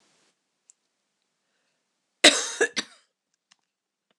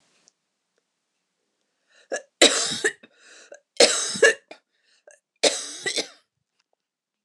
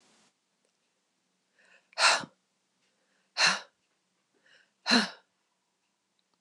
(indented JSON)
{
  "cough_length": "4.2 s",
  "cough_amplitude": 26027,
  "cough_signal_mean_std_ratio": 0.19,
  "three_cough_length": "7.2 s",
  "three_cough_amplitude": 26028,
  "three_cough_signal_mean_std_ratio": 0.29,
  "exhalation_length": "6.4 s",
  "exhalation_amplitude": 11848,
  "exhalation_signal_mean_std_ratio": 0.25,
  "survey_phase": "beta (2021-08-13 to 2022-03-07)",
  "age": "45-64",
  "gender": "Female",
  "wearing_mask": "No",
  "symptom_change_to_sense_of_smell_or_taste": true,
  "symptom_onset": "12 days",
  "smoker_status": "Never smoked",
  "respiratory_condition_asthma": false,
  "respiratory_condition_other": false,
  "recruitment_source": "REACT",
  "submission_delay": "2 days",
  "covid_test_result": "Negative",
  "covid_test_method": "RT-qPCR",
  "influenza_a_test_result": "Negative",
  "influenza_b_test_result": "Negative"
}